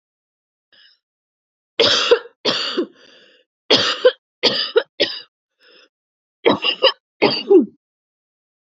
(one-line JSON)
{"three_cough_length": "8.6 s", "three_cough_amplitude": 32767, "three_cough_signal_mean_std_ratio": 0.38, "survey_phase": "beta (2021-08-13 to 2022-03-07)", "age": "18-44", "gender": "Female", "wearing_mask": "No", "symptom_cough_any": true, "symptom_sore_throat": true, "symptom_onset": "3 days", "smoker_status": "Never smoked", "respiratory_condition_asthma": false, "respiratory_condition_other": false, "recruitment_source": "Test and Trace", "submission_delay": "2 days", "covid_test_result": "Positive", "covid_test_method": "ePCR"}